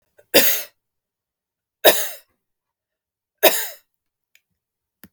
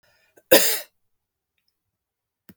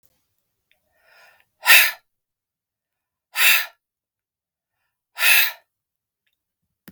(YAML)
three_cough_length: 5.1 s
three_cough_amplitude: 32768
three_cough_signal_mean_std_ratio: 0.27
cough_length: 2.6 s
cough_amplitude: 32768
cough_signal_mean_std_ratio: 0.23
exhalation_length: 6.9 s
exhalation_amplitude: 32768
exhalation_signal_mean_std_ratio: 0.27
survey_phase: beta (2021-08-13 to 2022-03-07)
age: 45-64
gender: Female
wearing_mask: 'No'
symptom_none: true
smoker_status: Ex-smoker
respiratory_condition_asthma: false
respiratory_condition_other: false
recruitment_source: REACT
submission_delay: 1 day
covid_test_result: Negative
covid_test_method: RT-qPCR